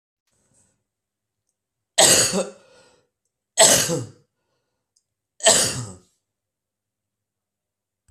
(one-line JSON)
{"three_cough_length": "8.1 s", "three_cough_amplitude": 32768, "three_cough_signal_mean_std_ratio": 0.3, "survey_phase": "beta (2021-08-13 to 2022-03-07)", "age": "65+", "gender": "Male", "wearing_mask": "No", "symptom_none": true, "smoker_status": "Never smoked", "respiratory_condition_asthma": false, "respiratory_condition_other": false, "recruitment_source": "REACT", "submission_delay": "0 days", "covid_test_result": "Negative", "covid_test_method": "RT-qPCR"}